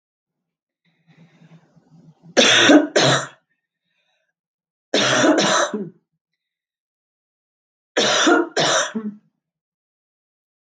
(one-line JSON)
{"three_cough_length": "10.7 s", "three_cough_amplitude": 32766, "three_cough_signal_mean_std_ratio": 0.4, "survey_phase": "beta (2021-08-13 to 2022-03-07)", "age": "45-64", "gender": "Female", "wearing_mask": "No", "symptom_cough_any": true, "symptom_shortness_of_breath": true, "symptom_sore_throat": true, "smoker_status": "Never smoked", "respiratory_condition_asthma": false, "respiratory_condition_other": false, "recruitment_source": "Test and Trace", "submission_delay": "2 days", "covid_test_result": "Positive", "covid_test_method": "RT-qPCR", "covid_ct_value": 35.5, "covid_ct_gene": "ORF1ab gene"}